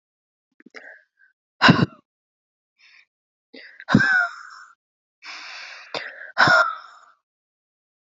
{
  "exhalation_length": "8.1 s",
  "exhalation_amplitude": 28357,
  "exhalation_signal_mean_std_ratio": 0.3,
  "survey_phase": "beta (2021-08-13 to 2022-03-07)",
  "age": "18-44",
  "gender": "Female",
  "wearing_mask": "No",
  "symptom_cough_any": true,
  "symptom_runny_or_blocked_nose": true,
  "symptom_sore_throat": true,
  "smoker_status": "Ex-smoker",
  "respiratory_condition_asthma": true,
  "respiratory_condition_other": false,
  "recruitment_source": "REACT",
  "submission_delay": "6 days",
  "covid_test_result": "Negative",
  "covid_test_method": "RT-qPCR",
  "influenza_a_test_result": "Negative",
  "influenza_b_test_result": "Negative"
}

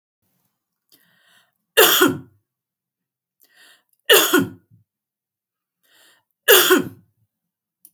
{
  "three_cough_length": "7.9 s",
  "three_cough_amplitude": 32768,
  "three_cough_signal_mean_std_ratio": 0.29,
  "survey_phase": "beta (2021-08-13 to 2022-03-07)",
  "age": "45-64",
  "gender": "Female",
  "wearing_mask": "No",
  "symptom_none": true,
  "symptom_onset": "4 days",
  "smoker_status": "Never smoked",
  "respiratory_condition_asthma": false,
  "respiratory_condition_other": false,
  "recruitment_source": "REACT",
  "submission_delay": "2 days",
  "covid_test_result": "Negative",
  "covid_test_method": "RT-qPCR"
}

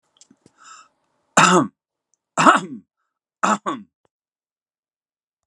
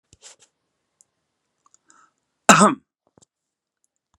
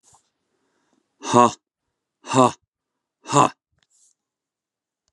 {
  "three_cough_length": "5.5 s",
  "three_cough_amplitude": 32767,
  "three_cough_signal_mean_std_ratio": 0.29,
  "cough_length": "4.2 s",
  "cough_amplitude": 32768,
  "cough_signal_mean_std_ratio": 0.18,
  "exhalation_length": "5.1 s",
  "exhalation_amplitude": 31753,
  "exhalation_signal_mean_std_ratio": 0.24,
  "survey_phase": "beta (2021-08-13 to 2022-03-07)",
  "age": "65+",
  "gender": "Male",
  "wearing_mask": "No",
  "symptom_none": true,
  "smoker_status": "Never smoked",
  "respiratory_condition_asthma": false,
  "respiratory_condition_other": false,
  "recruitment_source": "REACT",
  "submission_delay": "1 day",
  "covid_test_result": "Negative",
  "covid_test_method": "RT-qPCR"
}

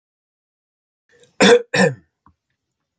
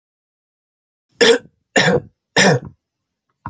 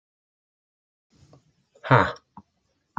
{
  "cough_length": "3.0 s",
  "cough_amplitude": 30553,
  "cough_signal_mean_std_ratio": 0.29,
  "three_cough_length": "3.5 s",
  "three_cough_amplitude": 30583,
  "three_cough_signal_mean_std_ratio": 0.36,
  "exhalation_length": "3.0 s",
  "exhalation_amplitude": 27814,
  "exhalation_signal_mean_std_ratio": 0.2,
  "survey_phase": "beta (2021-08-13 to 2022-03-07)",
  "age": "45-64",
  "gender": "Male",
  "wearing_mask": "No",
  "symptom_none": true,
  "smoker_status": "Never smoked",
  "respiratory_condition_asthma": false,
  "respiratory_condition_other": false,
  "recruitment_source": "REACT",
  "submission_delay": "3 days",
  "covid_test_result": "Negative",
  "covid_test_method": "RT-qPCR"
}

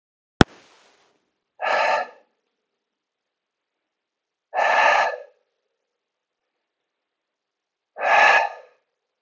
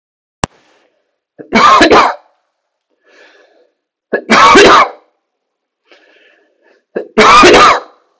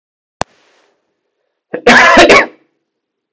{
  "exhalation_length": "9.2 s",
  "exhalation_amplitude": 32768,
  "exhalation_signal_mean_std_ratio": 0.32,
  "three_cough_length": "8.2 s",
  "three_cough_amplitude": 32768,
  "three_cough_signal_mean_std_ratio": 0.45,
  "cough_length": "3.3 s",
  "cough_amplitude": 32768,
  "cough_signal_mean_std_ratio": 0.39,
  "survey_phase": "beta (2021-08-13 to 2022-03-07)",
  "age": "18-44",
  "gender": "Male",
  "wearing_mask": "No",
  "symptom_none": true,
  "smoker_status": "Never smoked",
  "respiratory_condition_asthma": true,
  "respiratory_condition_other": false,
  "recruitment_source": "REACT",
  "submission_delay": "1 day",
  "covid_test_result": "Negative",
  "covid_test_method": "RT-qPCR",
  "influenza_a_test_result": "Negative",
  "influenza_b_test_result": "Negative"
}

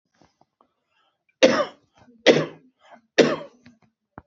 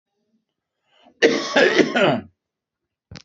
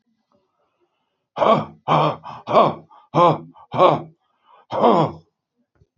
{
  "three_cough_length": "4.3 s",
  "three_cough_amplitude": 27918,
  "three_cough_signal_mean_std_ratio": 0.28,
  "cough_length": "3.2 s",
  "cough_amplitude": 27152,
  "cough_signal_mean_std_ratio": 0.41,
  "exhalation_length": "6.0 s",
  "exhalation_amplitude": 28055,
  "exhalation_signal_mean_std_ratio": 0.41,
  "survey_phase": "beta (2021-08-13 to 2022-03-07)",
  "age": "45-64",
  "gender": "Male",
  "wearing_mask": "No",
  "symptom_shortness_of_breath": true,
  "symptom_abdominal_pain": true,
  "symptom_fatigue": true,
  "symptom_onset": "12 days",
  "smoker_status": "Current smoker (11 or more cigarettes per day)",
  "respiratory_condition_asthma": false,
  "respiratory_condition_other": false,
  "recruitment_source": "REACT",
  "submission_delay": "6 days",
  "covid_test_result": "Negative",
  "covid_test_method": "RT-qPCR",
  "influenza_a_test_result": "Negative",
  "influenza_b_test_result": "Negative"
}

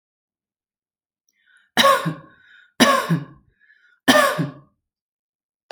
{
  "three_cough_length": "5.7 s",
  "three_cough_amplitude": 31650,
  "three_cough_signal_mean_std_ratio": 0.34,
  "survey_phase": "alpha (2021-03-01 to 2021-08-12)",
  "age": "18-44",
  "gender": "Female",
  "wearing_mask": "No",
  "symptom_headache": true,
  "symptom_onset": "12 days",
  "smoker_status": "Ex-smoker",
  "respiratory_condition_asthma": false,
  "respiratory_condition_other": false,
  "recruitment_source": "REACT",
  "submission_delay": "1 day",
  "covid_test_result": "Negative",
  "covid_test_method": "RT-qPCR"
}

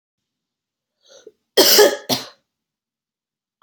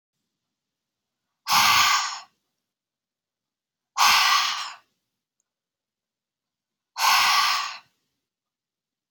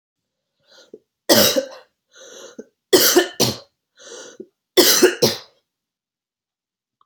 {
  "cough_length": "3.6 s",
  "cough_amplitude": 32767,
  "cough_signal_mean_std_ratio": 0.29,
  "exhalation_length": "9.1 s",
  "exhalation_amplitude": 18406,
  "exhalation_signal_mean_std_ratio": 0.39,
  "three_cough_length": "7.1 s",
  "three_cough_amplitude": 32768,
  "three_cough_signal_mean_std_ratio": 0.35,
  "survey_phase": "beta (2021-08-13 to 2022-03-07)",
  "age": "18-44",
  "gender": "Female",
  "wearing_mask": "No",
  "symptom_cough_any": true,
  "symptom_runny_or_blocked_nose": true,
  "symptom_sore_throat": true,
  "smoker_status": "Never smoked",
  "respiratory_condition_asthma": false,
  "respiratory_condition_other": false,
  "recruitment_source": "REACT",
  "submission_delay": "2 days",
  "covid_test_result": "Negative",
  "covid_test_method": "RT-qPCR",
  "influenza_a_test_result": "Negative",
  "influenza_b_test_result": "Negative"
}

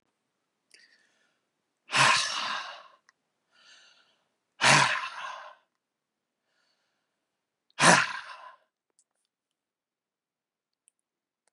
{
  "exhalation_length": "11.5 s",
  "exhalation_amplitude": 25362,
  "exhalation_signal_mean_std_ratio": 0.27,
  "survey_phase": "beta (2021-08-13 to 2022-03-07)",
  "age": "45-64",
  "gender": "Male",
  "wearing_mask": "No",
  "symptom_none": true,
  "smoker_status": "Ex-smoker",
  "respiratory_condition_asthma": false,
  "respiratory_condition_other": false,
  "recruitment_source": "REACT",
  "submission_delay": "3 days",
  "covid_test_result": "Negative",
  "covid_test_method": "RT-qPCR",
  "influenza_a_test_result": "Negative",
  "influenza_b_test_result": "Negative"
}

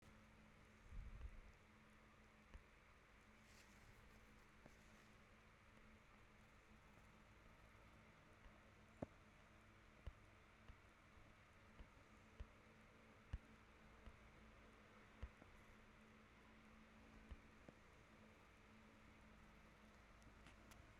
{
  "cough_length": "21.0 s",
  "cough_amplitude": 649,
  "cough_signal_mean_std_ratio": 0.79,
  "survey_phase": "beta (2021-08-13 to 2022-03-07)",
  "age": "18-44",
  "gender": "Female",
  "wearing_mask": "No",
  "symptom_cough_any": true,
  "symptom_runny_or_blocked_nose": true,
  "symptom_abdominal_pain": true,
  "symptom_fatigue": true,
  "symptom_headache": true,
  "symptom_change_to_sense_of_smell_or_taste": true,
  "symptom_loss_of_taste": true,
  "symptom_other": true,
  "symptom_onset": "3 days",
  "smoker_status": "Current smoker (1 to 10 cigarettes per day)",
  "respiratory_condition_asthma": false,
  "respiratory_condition_other": false,
  "recruitment_source": "Test and Trace",
  "submission_delay": "2 days",
  "covid_test_result": "Positive",
  "covid_test_method": "RT-qPCR",
  "covid_ct_value": 19.3,
  "covid_ct_gene": "ORF1ab gene",
  "covid_ct_mean": 19.6,
  "covid_viral_load": "360000 copies/ml",
  "covid_viral_load_category": "Low viral load (10K-1M copies/ml)"
}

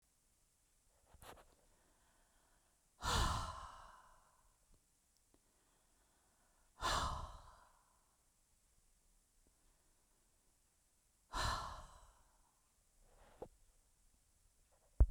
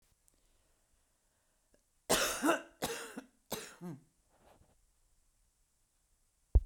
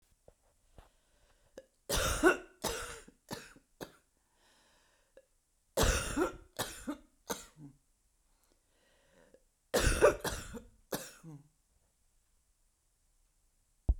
{
  "exhalation_length": "15.1 s",
  "exhalation_amplitude": 3886,
  "exhalation_signal_mean_std_ratio": 0.25,
  "cough_length": "6.7 s",
  "cough_amplitude": 6408,
  "cough_signal_mean_std_ratio": 0.26,
  "three_cough_length": "14.0 s",
  "three_cough_amplitude": 8253,
  "three_cough_signal_mean_std_ratio": 0.31,
  "survey_phase": "beta (2021-08-13 to 2022-03-07)",
  "age": "45-64",
  "gender": "Female",
  "wearing_mask": "No",
  "symptom_cough_any": true,
  "symptom_runny_or_blocked_nose": true,
  "symptom_shortness_of_breath": true,
  "symptom_onset": "12 days",
  "smoker_status": "Never smoked",
  "respiratory_condition_asthma": false,
  "respiratory_condition_other": false,
  "recruitment_source": "REACT",
  "submission_delay": "1 day",
  "covid_test_result": "Negative",
  "covid_test_method": "RT-qPCR",
  "influenza_a_test_result": "Negative",
  "influenza_b_test_result": "Negative"
}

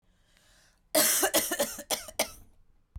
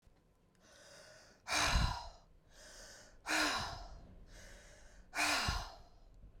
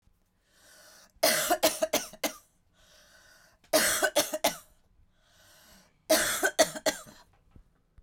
{
  "cough_length": "3.0 s",
  "cough_amplitude": 9577,
  "cough_signal_mean_std_ratio": 0.45,
  "exhalation_length": "6.4 s",
  "exhalation_amplitude": 2948,
  "exhalation_signal_mean_std_ratio": 0.5,
  "three_cough_length": "8.0 s",
  "three_cough_amplitude": 12611,
  "three_cough_signal_mean_std_ratio": 0.4,
  "survey_phase": "beta (2021-08-13 to 2022-03-07)",
  "age": "45-64",
  "gender": "Female",
  "wearing_mask": "No",
  "symptom_none": true,
  "smoker_status": "Never smoked",
  "respiratory_condition_asthma": false,
  "respiratory_condition_other": false,
  "recruitment_source": "REACT",
  "submission_delay": "2 days",
  "covid_test_result": "Negative",
  "covid_test_method": "RT-qPCR",
  "influenza_a_test_result": "Negative",
  "influenza_b_test_result": "Negative"
}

